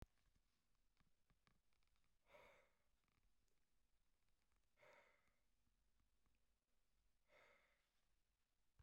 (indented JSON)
{
  "exhalation_length": "8.8 s",
  "exhalation_amplitude": 181,
  "exhalation_signal_mean_std_ratio": 0.64,
  "survey_phase": "beta (2021-08-13 to 2022-03-07)",
  "age": "45-64",
  "gender": "Male",
  "wearing_mask": "No",
  "symptom_none": true,
  "smoker_status": "Ex-smoker",
  "respiratory_condition_asthma": false,
  "respiratory_condition_other": false,
  "recruitment_source": "REACT",
  "submission_delay": "2 days",
  "covid_test_result": "Negative",
  "covid_test_method": "RT-qPCR",
  "influenza_a_test_result": "Unknown/Void",
  "influenza_b_test_result": "Unknown/Void"
}